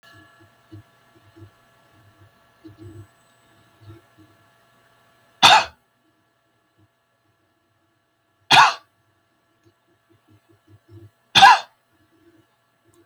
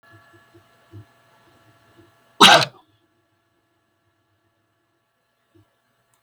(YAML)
three_cough_length: 13.1 s
three_cough_amplitude: 32768
three_cough_signal_mean_std_ratio: 0.19
cough_length: 6.2 s
cough_amplitude: 32768
cough_signal_mean_std_ratio: 0.17
survey_phase: beta (2021-08-13 to 2022-03-07)
age: 65+
gender: Male
wearing_mask: 'No'
symptom_none: true
smoker_status: Never smoked
respiratory_condition_asthma: false
respiratory_condition_other: false
recruitment_source: REACT
submission_delay: 1 day
covid_test_result: Negative
covid_test_method: RT-qPCR